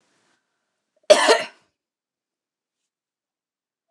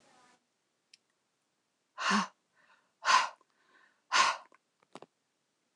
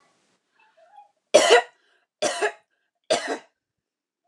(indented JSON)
{
  "cough_length": "3.9 s",
  "cough_amplitude": 29204,
  "cough_signal_mean_std_ratio": 0.2,
  "exhalation_length": "5.8 s",
  "exhalation_amplitude": 8802,
  "exhalation_signal_mean_std_ratio": 0.28,
  "three_cough_length": "4.3 s",
  "three_cough_amplitude": 28431,
  "three_cough_signal_mean_std_ratio": 0.29,
  "survey_phase": "beta (2021-08-13 to 2022-03-07)",
  "age": "18-44",
  "gender": "Female",
  "wearing_mask": "No",
  "symptom_fatigue": true,
  "symptom_onset": "7 days",
  "smoker_status": "Never smoked",
  "respiratory_condition_asthma": false,
  "respiratory_condition_other": false,
  "recruitment_source": "REACT",
  "submission_delay": "2 days",
  "covid_test_result": "Negative",
  "covid_test_method": "RT-qPCR",
  "influenza_a_test_result": "Negative",
  "influenza_b_test_result": "Negative"
}